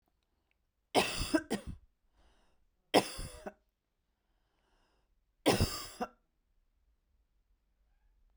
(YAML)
three_cough_length: 8.4 s
three_cough_amplitude: 9972
three_cough_signal_mean_std_ratio: 0.27
survey_phase: beta (2021-08-13 to 2022-03-07)
age: 18-44
gender: Female
wearing_mask: 'No'
symptom_runny_or_blocked_nose: true
symptom_headache: true
symptom_onset: 3 days
smoker_status: Never smoked
respiratory_condition_asthma: false
respiratory_condition_other: false
recruitment_source: Test and Trace
submission_delay: 2 days
covid_test_result: Positive
covid_test_method: RT-qPCR
covid_ct_value: 28.8
covid_ct_gene: N gene
covid_ct_mean: 28.9
covid_viral_load: 340 copies/ml
covid_viral_load_category: Minimal viral load (< 10K copies/ml)